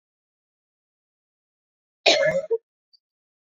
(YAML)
cough_length: 3.6 s
cough_amplitude: 26760
cough_signal_mean_std_ratio: 0.27
survey_phase: beta (2021-08-13 to 2022-03-07)
age: 18-44
gender: Female
wearing_mask: 'No'
symptom_cough_any: true
symptom_runny_or_blocked_nose: true
symptom_shortness_of_breath: true
symptom_fatigue: true
symptom_headache: true
smoker_status: Never smoked
respiratory_condition_asthma: true
respiratory_condition_other: false
recruitment_source: Test and Trace
submission_delay: 1 day
covid_test_result: Positive
covid_test_method: LFT